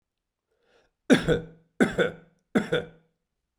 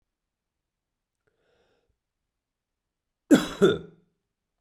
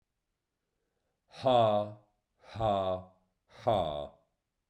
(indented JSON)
{
  "three_cough_length": "3.6 s",
  "three_cough_amplitude": 19352,
  "three_cough_signal_mean_std_ratio": 0.34,
  "cough_length": "4.6 s",
  "cough_amplitude": 19539,
  "cough_signal_mean_std_ratio": 0.2,
  "exhalation_length": "4.7 s",
  "exhalation_amplitude": 7012,
  "exhalation_signal_mean_std_ratio": 0.43,
  "survey_phase": "beta (2021-08-13 to 2022-03-07)",
  "age": "45-64",
  "gender": "Male",
  "wearing_mask": "No",
  "symptom_cough_any": true,
  "symptom_runny_or_blocked_nose": true,
  "symptom_fatigue": true,
  "symptom_change_to_sense_of_smell_or_taste": true,
  "symptom_loss_of_taste": true,
  "symptom_other": true,
  "symptom_onset": "5 days",
  "smoker_status": "Never smoked",
  "respiratory_condition_asthma": false,
  "respiratory_condition_other": false,
  "recruitment_source": "Test and Trace",
  "submission_delay": "3 days",
  "covid_test_result": "Positive",
  "covid_test_method": "RT-qPCR",
  "covid_ct_value": 16.4,
  "covid_ct_gene": "ORF1ab gene",
  "covid_ct_mean": 16.8,
  "covid_viral_load": "3100000 copies/ml",
  "covid_viral_load_category": "High viral load (>1M copies/ml)"
}